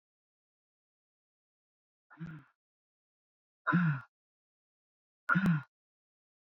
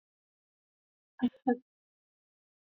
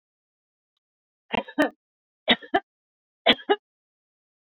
{
  "exhalation_length": "6.5 s",
  "exhalation_amplitude": 5141,
  "exhalation_signal_mean_std_ratio": 0.27,
  "cough_length": "2.6 s",
  "cough_amplitude": 5095,
  "cough_signal_mean_std_ratio": 0.19,
  "three_cough_length": "4.5 s",
  "three_cough_amplitude": 25307,
  "three_cough_signal_mean_std_ratio": 0.24,
  "survey_phase": "beta (2021-08-13 to 2022-03-07)",
  "age": "45-64",
  "gender": "Female",
  "wearing_mask": "No",
  "symptom_none": true,
  "symptom_onset": "12 days",
  "smoker_status": "Ex-smoker",
  "respiratory_condition_asthma": false,
  "respiratory_condition_other": false,
  "recruitment_source": "REACT",
  "submission_delay": "1 day",
  "covid_test_result": "Negative",
  "covid_test_method": "RT-qPCR",
  "influenza_a_test_result": "Negative",
  "influenza_b_test_result": "Negative"
}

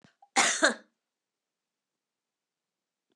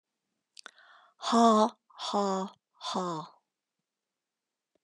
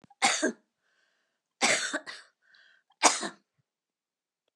{
  "cough_length": "3.2 s",
  "cough_amplitude": 13791,
  "cough_signal_mean_std_ratio": 0.24,
  "exhalation_length": "4.8 s",
  "exhalation_amplitude": 10683,
  "exhalation_signal_mean_std_ratio": 0.37,
  "three_cough_length": "4.6 s",
  "three_cough_amplitude": 18841,
  "three_cough_signal_mean_std_ratio": 0.32,
  "survey_phase": "beta (2021-08-13 to 2022-03-07)",
  "age": "65+",
  "gender": "Female",
  "wearing_mask": "No",
  "symptom_none": true,
  "smoker_status": "Never smoked",
  "respiratory_condition_asthma": false,
  "respiratory_condition_other": false,
  "recruitment_source": "REACT",
  "submission_delay": "3 days",
  "covid_test_result": "Negative",
  "covid_test_method": "RT-qPCR",
  "influenza_a_test_result": "Negative",
  "influenza_b_test_result": "Negative"
}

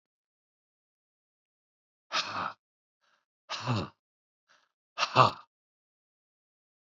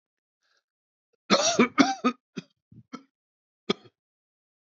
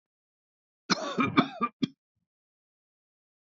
{
  "exhalation_length": "6.8 s",
  "exhalation_amplitude": 20598,
  "exhalation_signal_mean_std_ratio": 0.23,
  "three_cough_length": "4.6 s",
  "three_cough_amplitude": 20043,
  "three_cough_signal_mean_std_ratio": 0.28,
  "cough_length": "3.6 s",
  "cough_amplitude": 16660,
  "cough_signal_mean_std_ratio": 0.29,
  "survey_phase": "beta (2021-08-13 to 2022-03-07)",
  "age": "65+",
  "gender": "Male",
  "wearing_mask": "No",
  "symptom_none": true,
  "smoker_status": "Ex-smoker",
  "respiratory_condition_asthma": false,
  "respiratory_condition_other": false,
  "recruitment_source": "REACT",
  "submission_delay": "1 day",
  "covid_test_result": "Negative",
  "covid_test_method": "RT-qPCR",
  "influenza_a_test_result": "Negative",
  "influenza_b_test_result": "Negative"
}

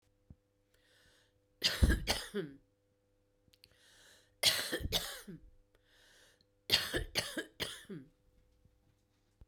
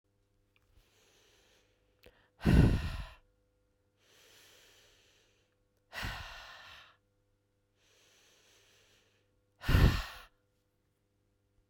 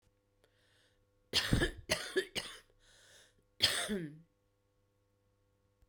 {
  "three_cough_length": "9.5 s",
  "three_cough_amplitude": 8622,
  "three_cough_signal_mean_std_ratio": 0.34,
  "exhalation_length": "11.7 s",
  "exhalation_amplitude": 8725,
  "exhalation_signal_mean_std_ratio": 0.24,
  "cough_length": "5.9 s",
  "cough_amplitude": 7248,
  "cough_signal_mean_std_ratio": 0.35,
  "survey_phase": "beta (2021-08-13 to 2022-03-07)",
  "age": "45-64",
  "gender": "Female",
  "wearing_mask": "No",
  "symptom_cough_any": true,
  "symptom_runny_or_blocked_nose": true,
  "symptom_sore_throat": true,
  "symptom_fatigue": true,
  "symptom_headache": true,
  "symptom_onset": "3 days",
  "smoker_status": "Current smoker (11 or more cigarettes per day)",
  "respiratory_condition_asthma": false,
  "respiratory_condition_other": false,
  "recruitment_source": "Test and Trace",
  "submission_delay": "2 days",
  "covid_test_result": "Positive",
  "covid_test_method": "RT-qPCR",
  "covid_ct_value": 16.0,
  "covid_ct_gene": "ORF1ab gene"
}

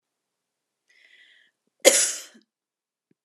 {
  "cough_length": "3.2 s",
  "cough_amplitude": 32767,
  "cough_signal_mean_std_ratio": 0.21,
  "survey_phase": "alpha (2021-03-01 to 2021-08-12)",
  "age": "18-44",
  "gender": "Female",
  "wearing_mask": "No",
  "symptom_none": true,
  "smoker_status": "Never smoked",
  "respiratory_condition_asthma": false,
  "respiratory_condition_other": false,
  "recruitment_source": "REACT",
  "submission_delay": "1 day",
  "covid_test_result": "Negative",
  "covid_test_method": "RT-qPCR"
}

